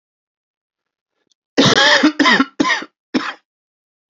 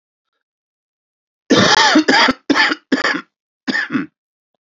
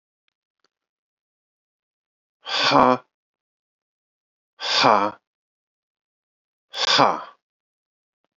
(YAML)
three_cough_length: 4.1 s
three_cough_amplitude: 31727
three_cough_signal_mean_std_ratio: 0.42
cough_length: 4.6 s
cough_amplitude: 30966
cough_signal_mean_std_ratio: 0.48
exhalation_length: 8.4 s
exhalation_amplitude: 29508
exhalation_signal_mean_std_ratio: 0.28
survey_phase: beta (2021-08-13 to 2022-03-07)
age: 45-64
gender: Male
wearing_mask: 'No'
symptom_cough_any: true
symptom_new_continuous_cough: true
symptom_runny_or_blocked_nose: true
symptom_shortness_of_breath: true
symptom_sore_throat: true
symptom_fatigue: true
symptom_fever_high_temperature: true
symptom_headache: true
symptom_change_to_sense_of_smell_or_taste: true
symptom_loss_of_taste: true
smoker_status: Never smoked
respiratory_condition_asthma: false
respiratory_condition_other: false
recruitment_source: Test and Trace
submission_delay: 3 days
covid_test_result: Positive
covid_test_method: RT-qPCR
covid_ct_value: 15.3
covid_ct_gene: S gene
covid_ct_mean: 15.6
covid_viral_load: 7900000 copies/ml
covid_viral_load_category: High viral load (>1M copies/ml)